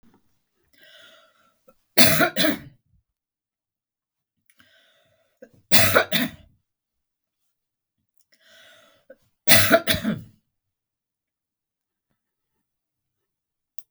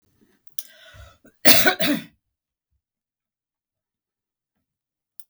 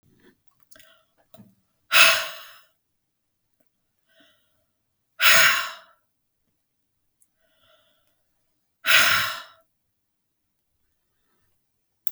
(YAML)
three_cough_length: 13.9 s
three_cough_amplitude: 32768
three_cough_signal_mean_std_ratio: 0.25
cough_length: 5.3 s
cough_amplitude: 32768
cough_signal_mean_std_ratio: 0.22
exhalation_length: 12.1 s
exhalation_amplitude: 32766
exhalation_signal_mean_std_ratio: 0.25
survey_phase: beta (2021-08-13 to 2022-03-07)
age: 65+
gender: Female
wearing_mask: 'No'
symptom_none: true
smoker_status: Ex-smoker
respiratory_condition_asthma: false
respiratory_condition_other: false
recruitment_source: REACT
submission_delay: 2 days
covid_test_result: Negative
covid_test_method: RT-qPCR
influenza_a_test_result: Negative
influenza_b_test_result: Negative